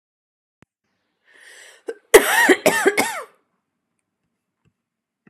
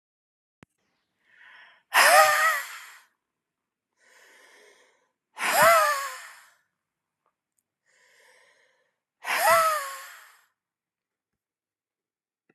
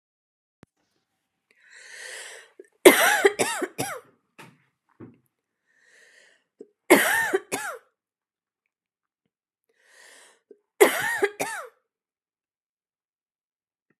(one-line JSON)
{"cough_length": "5.3 s", "cough_amplitude": 32768, "cough_signal_mean_std_ratio": 0.29, "exhalation_length": "12.5 s", "exhalation_amplitude": 21018, "exhalation_signal_mean_std_ratio": 0.32, "three_cough_length": "14.0 s", "three_cough_amplitude": 32766, "three_cough_signal_mean_std_ratio": 0.26, "survey_phase": "alpha (2021-03-01 to 2021-08-12)", "age": "45-64", "gender": "Female", "wearing_mask": "No", "symptom_none": true, "smoker_status": "Ex-smoker", "respiratory_condition_asthma": true, "respiratory_condition_other": false, "recruitment_source": "REACT", "submission_delay": "3 days", "covid_test_result": "Negative", "covid_test_method": "RT-qPCR"}